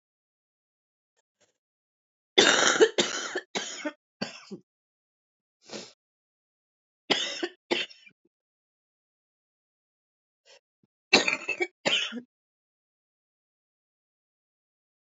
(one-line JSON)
{"three_cough_length": "15.0 s", "three_cough_amplitude": 25192, "three_cough_signal_mean_std_ratio": 0.27, "survey_phase": "beta (2021-08-13 to 2022-03-07)", "age": "18-44", "gender": "Female", "wearing_mask": "No", "symptom_cough_any": true, "symptom_headache": true, "smoker_status": "Ex-smoker", "respiratory_condition_asthma": false, "respiratory_condition_other": false, "recruitment_source": "REACT", "submission_delay": "1 day", "covid_test_result": "Negative", "covid_test_method": "RT-qPCR"}